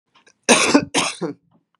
{
  "cough_length": "1.8 s",
  "cough_amplitude": 32757,
  "cough_signal_mean_std_ratio": 0.44,
  "survey_phase": "beta (2021-08-13 to 2022-03-07)",
  "age": "45-64",
  "gender": "Female",
  "wearing_mask": "No",
  "symptom_none": true,
  "smoker_status": "Ex-smoker",
  "respiratory_condition_asthma": false,
  "respiratory_condition_other": false,
  "recruitment_source": "REACT",
  "submission_delay": "1 day",
  "covid_test_result": "Negative",
  "covid_test_method": "RT-qPCR",
  "influenza_a_test_result": "Negative",
  "influenza_b_test_result": "Negative"
}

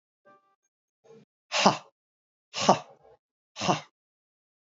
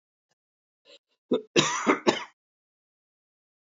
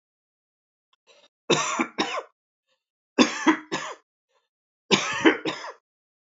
{
  "exhalation_length": "4.6 s",
  "exhalation_amplitude": 26300,
  "exhalation_signal_mean_std_ratio": 0.25,
  "cough_length": "3.7 s",
  "cough_amplitude": 20049,
  "cough_signal_mean_std_ratio": 0.29,
  "three_cough_length": "6.4 s",
  "three_cough_amplitude": 24415,
  "three_cough_signal_mean_std_ratio": 0.35,
  "survey_phase": "beta (2021-08-13 to 2022-03-07)",
  "age": "65+",
  "gender": "Male",
  "wearing_mask": "No",
  "symptom_none": true,
  "smoker_status": "Prefer not to say",
  "respiratory_condition_asthma": false,
  "respiratory_condition_other": false,
  "recruitment_source": "REACT",
  "submission_delay": "1 day",
  "covid_test_result": "Negative",
  "covid_test_method": "RT-qPCR",
  "influenza_a_test_result": "Negative",
  "influenza_b_test_result": "Negative"
}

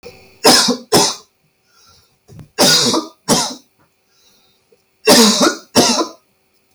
{
  "three_cough_length": "6.7 s",
  "three_cough_amplitude": 32768,
  "three_cough_signal_mean_std_ratio": 0.47,
  "survey_phase": "beta (2021-08-13 to 2022-03-07)",
  "age": "45-64",
  "gender": "Male",
  "wearing_mask": "No",
  "symptom_none": true,
  "smoker_status": "Never smoked",
  "respiratory_condition_asthma": false,
  "respiratory_condition_other": false,
  "recruitment_source": "REACT",
  "submission_delay": "3 days",
  "covid_test_result": "Negative",
  "covid_test_method": "RT-qPCR"
}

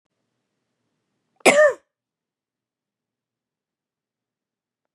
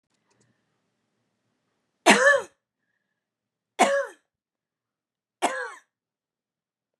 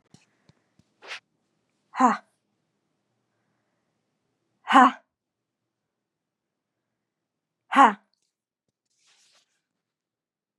{
  "cough_length": "4.9 s",
  "cough_amplitude": 30784,
  "cough_signal_mean_std_ratio": 0.19,
  "three_cough_length": "7.0 s",
  "three_cough_amplitude": 26567,
  "three_cough_signal_mean_std_ratio": 0.25,
  "exhalation_length": "10.6 s",
  "exhalation_amplitude": 25933,
  "exhalation_signal_mean_std_ratio": 0.17,
  "survey_phase": "beta (2021-08-13 to 2022-03-07)",
  "age": "45-64",
  "gender": "Female",
  "wearing_mask": "No",
  "symptom_runny_or_blocked_nose": true,
  "symptom_sore_throat": true,
  "symptom_abdominal_pain": true,
  "symptom_fatigue": true,
  "symptom_fever_high_temperature": true,
  "symptom_headache": true,
  "symptom_change_to_sense_of_smell_or_taste": true,
  "symptom_loss_of_taste": true,
  "symptom_other": true,
  "symptom_onset": "4 days",
  "smoker_status": "Never smoked",
  "respiratory_condition_asthma": false,
  "respiratory_condition_other": false,
  "recruitment_source": "Test and Trace",
  "submission_delay": "2 days",
  "covid_test_result": "Positive",
  "covid_test_method": "RT-qPCR",
  "covid_ct_value": 18.5,
  "covid_ct_gene": "ORF1ab gene",
  "covid_ct_mean": 19.1,
  "covid_viral_load": "540000 copies/ml",
  "covid_viral_load_category": "Low viral load (10K-1M copies/ml)"
}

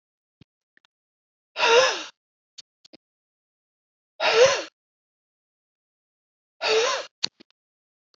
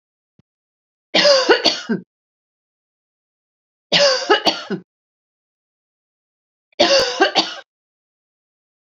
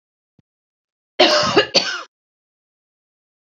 {
  "exhalation_length": "8.2 s",
  "exhalation_amplitude": 21125,
  "exhalation_signal_mean_std_ratio": 0.3,
  "three_cough_length": "9.0 s",
  "three_cough_amplitude": 32767,
  "three_cough_signal_mean_std_ratio": 0.36,
  "cough_length": "3.6 s",
  "cough_amplitude": 28258,
  "cough_signal_mean_std_ratio": 0.33,
  "survey_phase": "beta (2021-08-13 to 2022-03-07)",
  "age": "45-64",
  "gender": "Female",
  "wearing_mask": "No",
  "symptom_runny_or_blocked_nose": true,
  "symptom_abdominal_pain": true,
  "symptom_onset": "7 days",
  "smoker_status": "Never smoked",
  "respiratory_condition_asthma": false,
  "respiratory_condition_other": false,
  "recruitment_source": "REACT",
  "submission_delay": "1 day",
  "covid_test_result": "Negative",
  "covid_test_method": "RT-qPCR"
}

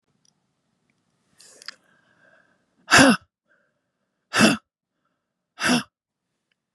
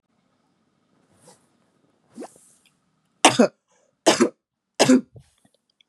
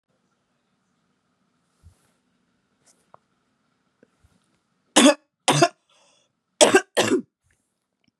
{
  "exhalation_length": "6.7 s",
  "exhalation_amplitude": 28473,
  "exhalation_signal_mean_std_ratio": 0.25,
  "three_cough_length": "5.9 s",
  "three_cough_amplitude": 32035,
  "three_cough_signal_mean_std_ratio": 0.24,
  "cough_length": "8.2 s",
  "cough_amplitude": 32676,
  "cough_signal_mean_std_ratio": 0.23,
  "survey_phase": "beta (2021-08-13 to 2022-03-07)",
  "age": "18-44",
  "gender": "Female",
  "wearing_mask": "Yes",
  "symptom_cough_any": true,
  "symptom_runny_or_blocked_nose": true,
  "symptom_sore_throat": true,
  "symptom_abdominal_pain": true,
  "symptom_fatigue": true,
  "symptom_fever_high_temperature": true,
  "symptom_headache": true,
  "symptom_change_to_sense_of_smell_or_taste": true,
  "symptom_loss_of_taste": true,
  "symptom_onset": "6 days",
  "smoker_status": "Never smoked",
  "respiratory_condition_asthma": false,
  "respiratory_condition_other": false,
  "recruitment_source": "Test and Trace",
  "submission_delay": "2 days",
  "covid_test_result": "Positive",
  "covid_test_method": "RT-qPCR",
  "covid_ct_value": 21.5,
  "covid_ct_gene": "ORF1ab gene",
  "covid_ct_mean": 21.8,
  "covid_viral_load": "72000 copies/ml",
  "covid_viral_load_category": "Low viral load (10K-1M copies/ml)"
}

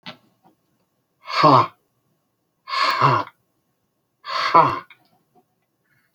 {
  "exhalation_length": "6.1 s",
  "exhalation_amplitude": 29990,
  "exhalation_signal_mean_std_ratio": 0.35,
  "survey_phase": "beta (2021-08-13 to 2022-03-07)",
  "age": "65+",
  "gender": "Male",
  "wearing_mask": "No",
  "symptom_none": true,
  "smoker_status": "Ex-smoker",
  "respiratory_condition_asthma": false,
  "respiratory_condition_other": false,
  "recruitment_source": "REACT",
  "submission_delay": "1 day",
  "covid_test_result": "Negative",
  "covid_test_method": "RT-qPCR"
}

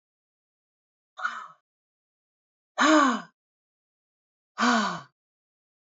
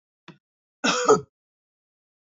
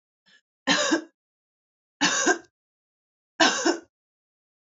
{
  "exhalation_length": "6.0 s",
  "exhalation_amplitude": 13089,
  "exhalation_signal_mean_std_ratio": 0.31,
  "cough_length": "2.3 s",
  "cough_amplitude": 22818,
  "cough_signal_mean_std_ratio": 0.28,
  "three_cough_length": "4.8 s",
  "three_cough_amplitude": 19733,
  "three_cough_signal_mean_std_ratio": 0.37,
  "survey_phase": "beta (2021-08-13 to 2022-03-07)",
  "age": "18-44",
  "gender": "Female",
  "wearing_mask": "No",
  "symptom_runny_or_blocked_nose": true,
  "symptom_fatigue": true,
  "symptom_headache": true,
  "symptom_onset": "4 days",
  "smoker_status": "Ex-smoker",
  "respiratory_condition_asthma": false,
  "respiratory_condition_other": false,
  "recruitment_source": "Test and Trace",
  "submission_delay": "2 days",
  "covid_test_result": "Positive",
  "covid_test_method": "RT-qPCR",
  "covid_ct_value": 18.8,
  "covid_ct_gene": "ORF1ab gene",
  "covid_ct_mean": 19.1,
  "covid_viral_load": "540000 copies/ml",
  "covid_viral_load_category": "Low viral load (10K-1M copies/ml)"
}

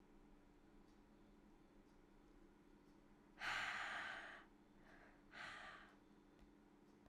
{
  "exhalation_length": "7.1 s",
  "exhalation_amplitude": 608,
  "exhalation_signal_mean_std_ratio": 0.54,
  "survey_phase": "alpha (2021-03-01 to 2021-08-12)",
  "age": "18-44",
  "gender": "Female",
  "wearing_mask": "No",
  "symptom_cough_any": true,
  "symptom_shortness_of_breath": true,
  "symptom_fatigue": true,
  "symptom_headache": true,
  "symptom_onset": "3 days",
  "smoker_status": "Ex-smoker",
  "respiratory_condition_asthma": false,
  "respiratory_condition_other": false,
  "recruitment_source": "Test and Trace",
  "submission_delay": "2 days",
  "covid_test_result": "Positive",
  "covid_test_method": "RT-qPCR",
  "covid_ct_value": 30.6,
  "covid_ct_gene": "S gene",
  "covid_ct_mean": 31.8,
  "covid_viral_load": "37 copies/ml",
  "covid_viral_load_category": "Minimal viral load (< 10K copies/ml)"
}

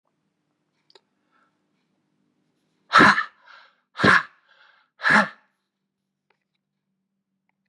{
  "exhalation_length": "7.7 s",
  "exhalation_amplitude": 29655,
  "exhalation_signal_mean_std_ratio": 0.24,
  "survey_phase": "beta (2021-08-13 to 2022-03-07)",
  "age": "65+",
  "gender": "Male",
  "wearing_mask": "No",
  "symptom_cough_any": true,
  "symptom_runny_or_blocked_nose": true,
  "symptom_fatigue": true,
  "symptom_fever_high_temperature": true,
  "symptom_headache": true,
  "symptom_onset": "3 days",
  "smoker_status": "Never smoked",
  "respiratory_condition_asthma": false,
  "respiratory_condition_other": false,
  "recruitment_source": "Test and Trace",
  "submission_delay": "1 day",
  "covid_test_result": "Positive",
  "covid_test_method": "RT-qPCR",
  "covid_ct_value": 29.4,
  "covid_ct_gene": "N gene"
}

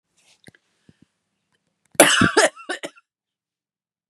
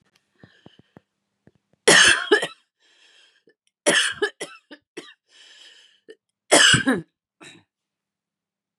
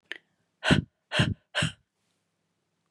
{
  "cough_length": "4.1 s",
  "cough_amplitude": 32768,
  "cough_signal_mean_std_ratio": 0.27,
  "three_cough_length": "8.8 s",
  "three_cough_amplitude": 30144,
  "three_cough_signal_mean_std_ratio": 0.3,
  "exhalation_length": "2.9 s",
  "exhalation_amplitude": 14897,
  "exhalation_signal_mean_std_ratio": 0.32,
  "survey_phase": "beta (2021-08-13 to 2022-03-07)",
  "age": "45-64",
  "gender": "Female",
  "wearing_mask": "No",
  "symptom_cough_any": true,
  "symptom_runny_or_blocked_nose": true,
  "symptom_shortness_of_breath": true,
  "symptom_sore_throat": true,
  "symptom_diarrhoea": true,
  "symptom_headache": true,
  "symptom_onset": "1 day",
  "smoker_status": "Never smoked",
  "respiratory_condition_asthma": false,
  "respiratory_condition_other": false,
  "recruitment_source": "Test and Trace",
  "submission_delay": "1 day",
  "covid_test_result": "Positive",
  "covid_test_method": "RT-qPCR",
  "covid_ct_value": 27.4,
  "covid_ct_gene": "ORF1ab gene"
}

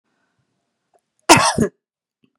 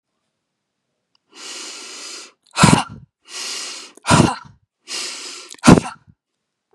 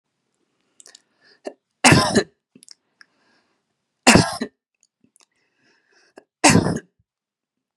{
  "cough_length": "2.4 s",
  "cough_amplitude": 32768,
  "cough_signal_mean_std_ratio": 0.27,
  "exhalation_length": "6.7 s",
  "exhalation_amplitude": 32768,
  "exhalation_signal_mean_std_ratio": 0.31,
  "three_cough_length": "7.8 s",
  "three_cough_amplitude": 32767,
  "three_cough_signal_mean_std_ratio": 0.26,
  "survey_phase": "beta (2021-08-13 to 2022-03-07)",
  "age": "45-64",
  "gender": "Female",
  "wearing_mask": "No",
  "symptom_fatigue": true,
  "smoker_status": "Ex-smoker",
  "respiratory_condition_asthma": false,
  "respiratory_condition_other": false,
  "recruitment_source": "Test and Trace",
  "submission_delay": "2 days",
  "covid_test_result": "Negative",
  "covid_test_method": "RT-qPCR"
}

